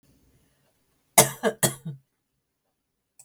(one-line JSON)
{"cough_length": "3.2 s", "cough_amplitude": 32766, "cough_signal_mean_std_ratio": 0.22, "survey_phase": "beta (2021-08-13 to 2022-03-07)", "age": "45-64", "gender": "Female", "wearing_mask": "No", "symptom_cough_any": true, "symptom_runny_or_blocked_nose": true, "smoker_status": "Ex-smoker", "respiratory_condition_asthma": false, "respiratory_condition_other": false, "recruitment_source": "REACT", "submission_delay": "1 day", "covid_test_result": "Negative", "covid_test_method": "RT-qPCR"}